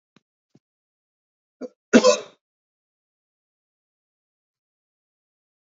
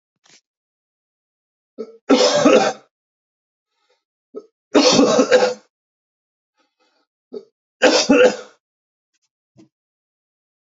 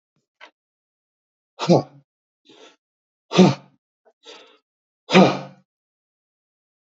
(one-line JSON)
{"cough_length": "5.7 s", "cough_amplitude": 30304, "cough_signal_mean_std_ratio": 0.15, "three_cough_length": "10.7 s", "three_cough_amplitude": 29045, "three_cough_signal_mean_std_ratio": 0.35, "exhalation_length": "6.9 s", "exhalation_amplitude": 28235, "exhalation_signal_mean_std_ratio": 0.23, "survey_phase": "beta (2021-08-13 to 2022-03-07)", "age": "45-64", "gender": "Male", "wearing_mask": "No", "symptom_cough_any": true, "smoker_status": "Never smoked", "respiratory_condition_asthma": false, "respiratory_condition_other": false, "recruitment_source": "Test and Trace", "submission_delay": "2 days", "covid_test_method": "RT-qPCR"}